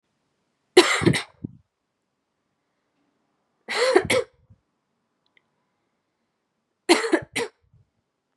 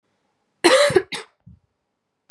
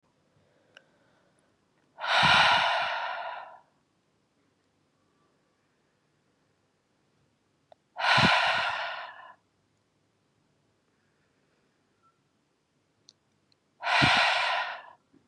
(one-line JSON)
{"three_cough_length": "8.4 s", "three_cough_amplitude": 31482, "three_cough_signal_mean_std_ratio": 0.28, "cough_length": "2.3 s", "cough_amplitude": 29546, "cough_signal_mean_std_ratio": 0.33, "exhalation_length": "15.3 s", "exhalation_amplitude": 12847, "exhalation_signal_mean_std_ratio": 0.36, "survey_phase": "beta (2021-08-13 to 2022-03-07)", "age": "18-44", "gender": "Female", "wearing_mask": "No", "symptom_cough_any": true, "symptom_new_continuous_cough": true, "symptom_runny_or_blocked_nose": true, "symptom_sore_throat": true, "symptom_fatigue": true, "symptom_fever_high_temperature": true, "symptom_headache": true, "symptom_onset": "4 days", "smoker_status": "Never smoked", "respiratory_condition_asthma": false, "respiratory_condition_other": false, "recruitment_source": "Test and Trace", "submission_delay": "2 days", "covid_test_result": "Positive", "covid_test_method": "RT-qPCR", "covid_ct_value": 17.2, "covid_ct_gene": "ORF1ab gene", "covid_ct_mean": 17.5, "covid_viral_load": "1800000 copies/ml", "covid_viral_load_category": "High viral load (>1M copies/ml)"}